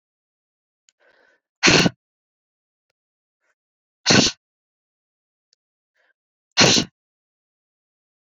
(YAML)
exhalation_length: 8.4 s
exhalation_amplitude: 29182
exhalation_signal_mean_std_ratio: 0.24
survey_phase: beta (2021-08-13 to 2022-03-07)
age: 18-44
gender: Female
wearing_mask: 'No'
symptom_cough_any: true
symptom_new_continuous_cough: true
symptom_fatigue: true
symptom_fever_high_temperature: true
symptom_headache: true
symptom_change_to_sense_of_smell_or_taste: true
symptom_loss_of_taste: true
smoker_status: Never smoked
respiratory_condition_asthma: true
respiratory_condition_other: false
recruitment_source: Test and Trace
submission_delay: 2 days
covid_test_result: Negative
covid_test_method: LAMP